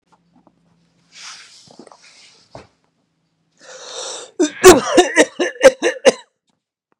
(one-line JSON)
{"cough_length": "7.0 s", "cough_amplitude": 32768, "cough_signal_mean_std_ratio": 0.29, "survey_phase": "beta (2021-08-13 to 2022-03-07)", "age": "45-64", "gender": "Male", "wearing_mask": "No", "symptom_none": true, "smoker_status": "Never smoked", "respiratory_condition_asthma": false, "respiratory_condition_other": false, "recruitment_source": "REACT", "submission_delay": "2 days", "covid_test_result": "Negative", "covid_test_method": "RT-qPCR", "influenza_a_test_result": "Negative", "influenza_b_test_result": "Negative"}